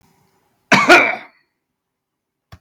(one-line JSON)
{"cough_length": "2.6 s", "cough_amplitude": 32768, "cough_signal_mean_std_ratio": 0.31, "survey_phase": "beta (2021-08-13 to 2022-03-07)", "age": "45-64", "gender": "Male", "wearing_mask": "No", "symptom_none": true, "smoker_status": "Ex-smoker", "respiratory_condition_asthma": false, "respiratory_condition_other": false, "recruitment_source": "REACT", "submission_delay": "3 days", "covid_test_result": "Negative", "covid_test_method": "RT-qPCR"}